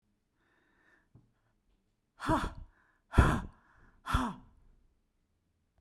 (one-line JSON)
{"exhalation_length": "5.8 s", "exhalation_amplitude": 12386, "exhalation_signal_mean_std_ratio": 0.27, "survey_phase": "beta (2021-08-13 to 2022-03-07)", "age": "65+", "gender": "Female", "wearing_mask": "No", "symptom_none": true, "smoker_status": "Ex-smoker", "respiratory_condition_asthma": false, "respiratory_condition_other": false, "recruitment_source": "Test and Trace", "submission_delay": "3 days", "covid_test_result": "Negative", "covid_test_method": "RT-qPCR"}